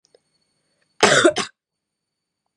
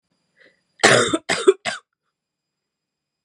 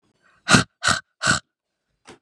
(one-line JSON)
{"cough_length": "2.6 s", "cough_amplitude": 32638, "cough_signal_mean_std_ratio": 0.29, "three_cough_length": "3.2 s", "three_cough_amplitude": 32767, "three_cough_signal_mean_std_ratio": 0.31, "exhalation_length": "2.2 s", "exhalation_amplitude": 32496, "exhalation_signal_mean_std_ratio": 0.33, "survey_phase": "beta (2021-08-13 to 2022-03-07)", "age": "18-44", "gender": "Female", "wearing_mask": "No", "symptom_new_continuous_cough": true, "symptom_runny_or_blocked_nose": true, "symptom_fatigue": true, "symptom_change_to_sense_of_smell_or_taste": true, "smoker_status": "Never smoked", "respiratory_condition_asthma": false, "respiratory_condition_other": false, "recruitment_source": "Test and Trace", "submission_delay": "2 days", "covid_test_result": "Positive", "covid_test_method": "RT-qPCR"}